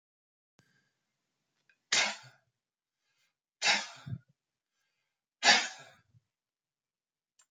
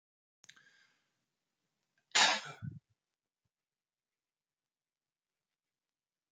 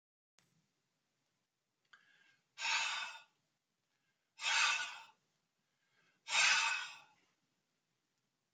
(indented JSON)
{
  "three_cough_length": "7.5 s",
  "three_cough_amplitude": 10985,
  "three_cough_signal_mean_std_ratio": 0.23,
  "cough_length": "6.3 s",
  "cough_amplitude": 5862,
  "cough_signal_mean_std_ratio": 0.17,
  "exhalation_length": "8.5 s",
  "exhalation_amplitude": 3738,
  "exhalation_signal_mean_std_ratio": 0.34,
  "survey_phase": "alpha (2021-03-01 to 2021-08-12)",
  "age": "65+",
  "gender": "Male",
  "wearing_mask": "No",
  "symptom_none": true,
  "smoker_status": "Never smoked",
  "respiratory_condition_asthma": false,
  "respiratory_condition_other": false,
  "recruitment_source": "REACT",
  "submission_delay": "2 days",
  "covid_test_result": "Negative",
  "covid_test_method": "RT-qPCR"
}